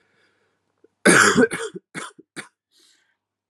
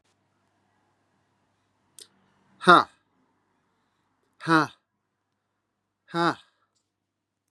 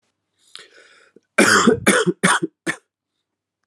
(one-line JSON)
{"cough_length": "3.5 s", "cough_amplitude": 27537, "cough_signal_mean_std_ratio": 0.32, "exhalation_length": "7.5 s", "exhalation_amplitude": 31386, "exhalation_signal_mean_std_ratio": 0.18, "three_cough_length": "3.7 s", "three_cough_amplitude": 30984, "three_cough_signal_mean_std_ratio": 0.4, "survey_phase": "alpha (2021-03-01 to 2021-08-12)", "age": "18-44", "gender": "Male", "wearing_mask": "No", "symptom_cough_any": true, "symptom_fatigue": true, "symptom_fever_high_temperature": true, "symptom_headache": true, "smoker_status": "Never smoked", "respiratory_condition_asthma": false, "respiratory_condition_other": false, "recruitment_source": "Test and Trace", "submission_delay": "2 days", "covid_test_result": "Positive", "covid_test_method": "RT-qPCR", "covid_ct_value": 16.9, "covid_ct_gene": "ORF1ab gene", "covid_ct_mean": 18.2, "covid_viral_load": "1100000 copies/ml", "covid_viral_load_category": "High viral load (>1M copies/ml)"}